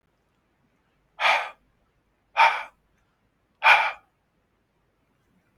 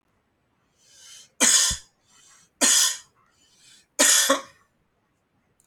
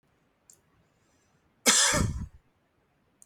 {
  "exhalation_length": "5.6 s",
  "exhalation_amplitude": 24148,
  "exhalation_signal_mean_std_ratio": 0.27,
  "three_cough_length": "5.7 s",
  "three_cough_amplitude": 21336,
  "three_cough_signal_mean_std_ratio": 0.36,
  "cough_length": "3.3 s",
  "cough_amplitude": 13976,
  "cough_signal_mean_std_ratio": 0.33,
  "survey_phase": "beta (2021-08-13 to 2022-03-07)",
  "age": "45-64",
  "gender": "Male",
  "wearing_mask": "No",
  "symptom_cough_any": true,
  "symptom_runny_or_blocked_nose": true,
  "symptom_sore_throat": true,
  "symptom_onset": "12 days",
  "smoker_status": "Never smoked",
  "respiratory_condition_asthma": false,
  "respiratory_condition_other": false,
  "recruitment_source": "REACT",
  "submission_delay": "1 day",
  "covid_test_result": "Negative",
  "covid_test_method": "RT-qPCR"
}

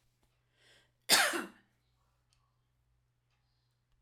{
  "cough_length": "4.0 s",
  "cough_amplitude": 9443,
  "cough_signal_mean_std_ratio": 0.22,
  "survey_phase": "alpha (2021-03-01 to 2021-08-12)",
  "age": "45-64",
  "gender": "Female",
  "wearing_mask": "No",
  "symptom_cough_any": true,
  "symptom_fatigue": true,
  "symptom_fever_high_temperature": true,
  "symptom_onset": "3 days",
  "smoker_status": "Never smoked",
  "respiratory_condition_asthma": false,
  "respiratory_condition_other": false,
  "recruitment_source": "Test and Trace",
  "submission_delay": "1 day",
  "covid_test_result": "Positive",
  "covid_test_method": "RT-qPCR"
}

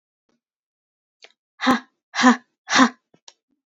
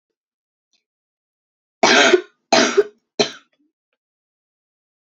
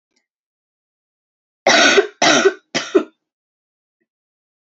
{
  "exhalation_length": "3.8 s",
  "exhalation_amplitude": 26139,
  "exhalation_signal_mean_std_ratio": 0.29,
  "three_cough_length": "5.0 s",
  "three_cough_amplitude": 29421,
  "three_cough_signal_mean_std_ratio": 0.3,
  "cough_length": "4.6 s",
  "cough_amplitude": 31899,
  "cough_signal_mean_std_ratio": 0.35,
  "survey_phase": "alpha (2021-03-01 to 2021-08-12)",
  "age": "18-44",
  "gender": "Female",
  "wearing_mask": "No",
  "symptom_cough_any": true,
  "symptom_shortness_of_breath": true,
  "symptom_headache": true,
  "symptom_change_to_sense_of_smell_or_taste": true,
  "symptom_onset": "3 days",
  "smoker_status": "Never smoked",
  "respiratory_condition_asthma": true,
  "respiratory_condition_other": false,
  "recruitment_source": "Test and Trace",
  "submission_delay": "2 days",
  "covid_test_result": "Positive",
  "covid_test_method": "RT-qPCR",
  "covid_ct_value": 34.2,
  "covid_ct_gene": "N gene",
  "covid_ct_mean": 34.4,
  "covid_viral_load": "5.1 copies/ml",
  "covid_viral_load_category": "Minimal viral load (< 10K copies/ml)"
}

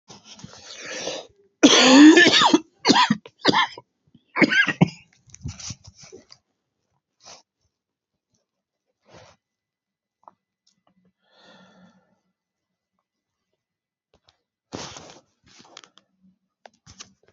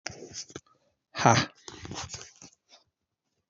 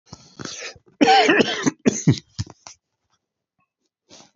{
  "three_cough_length": "17.3 s",
  "three_cough_amplitude": 29488,
  "three_cough_signal_mean_std_ratio": 0.26,
  "exhalation_length": "3.5 s",
  "exhalation_amplitude": 21641,
  "exhalation_signal_mean_std_ratio": 0.27,
  "cough_length": "4.4 s",
  "cough_amplitude": 28253,
  "cough_signal_mean_std_ratio": 0.37,
  "survey_phase": "beta (2021-08-13 to 2022-03-07)",
  "age": "45-64",
  "gender": "Male",
  "wearing_mask": "No",
  "symptom_cough_any": true,
  "symptom_runny_or_blocked_nose": true,
  "symptom_shortness_of_breath": true,
  "symptom_sore_throat": true,
  "symptom_abdominal_pain": true,
  "symptom_fatigue": true,
  "symptom_fever_high_temperature": true,
  "symptom_headache": true,
  "symptom_other": true,
  "symptom_onset": "3 days",
  "smoker_status": "Never smoked",
  "respiratory_condition_asthma": false,
  "respiratory_condition_other": false,
  "recruitment_source": "Test and Trace",
  "submission_delay": "1 day",
  "covid_test_result": "Positive",
  "covid_test_method": "RT-qPCR"
}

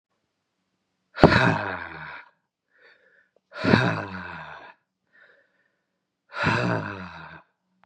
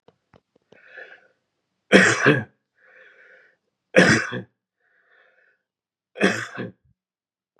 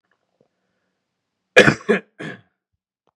{
  "exhalation_length": "7.9 s",
  "exhalation_amplitude": 32767,
  "exhalation_signal_mean_std_ratio": 0.34,
  "three_cough_length": "7.6 s",
  "three_cough_amplitude": 32767,
  "three_cough_signal_mean_std_ratio": 0.29,
  "cough_length": "3.2 s",
  "cough_amplitude": 32768,
  "cough_signal_mean_std_ratio": 0.22,
  "survey_phase": "beta (2021-08-13 to 2022-03-07)",
  "age": "18-44",
  "gender": "Male",
  "wearing_mask": "No",
  "symptom_cough_any": true,
  "symptom_new_continuous_cough": true,
  "symptom_shortness_of_breath": true,
  "symptom_sore_throat": true,
  "symptom_fatigue": true,
  "symptom_headache": true,
  "symptom_onset": "3 days",
  "smoker_status": "Never smoked",
  "respiratory_condition_asthma": true,
  "respiratory_condition_other": false,
  "recruitment_source": "Test and Trace",
  "submission_delay": "1 day",
  "covid_test_result": "Positive",
  "covid_test_method": "RT-qPCR",
  "covid_ct_value": 26.4,
  "covid_ct_gene": "ORF1ab gene",
  "covid_ct_mean": 26.7,
  "covid_viral_load": "1800 copies/ml",
  "covid_viral_load_category": "Minimal viral load (< 10K copies/ml)"
}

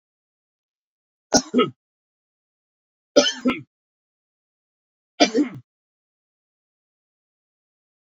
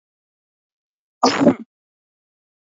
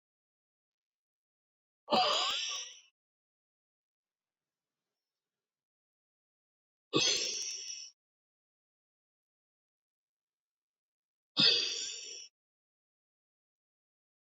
{
  "three_cough_length": "8.1 s",
  "three_cough_amplitude": 29504,
  "three_cough_signal_mean_std_ratio": 0.22,
  "cough_length": "2.6 s",
  "cough_amplitude": 27202,
  "cough_signal_mean_std_ratio": 0.26,
  "exhalation_length": "14.3 s",
  "exhalation_amplitude": 6664,
  "exhalation_signal_mean_std_ratio": 0.28,
  "survey_phase": "beta (2021-08-13 to 2022-03-07)",
  "age": "45-64",
  "gender": "Male",
  "wearing_mask": "No",
  "symptom_cough_any": true,
  "symptom_fatigue": true,
  "symptom_headache": true,
  "symptom_loss_of_taste": true,
  "symptom_onset": "4 days",
  "smoker_status": "Never smoked",
  "respiratory_condition_asthma": false,
  "respiratory_condition_other": false,
  "recruitment_source": "Test and Trace",
  "submission_delay": "2 days",
  "covid_test_result": "Positive",
  "covid_test_method": "RT-qPCR",
  "covid_ct_value": 14.6,
  "covid_ct_gene": "ORF1ab gene",
  "covid_ct_mean": 14.9,
  "covid_viral_load": "13000000 copies/ml",
  "covid_viral_load_category": "High viral load (>1M copies/ml)"
}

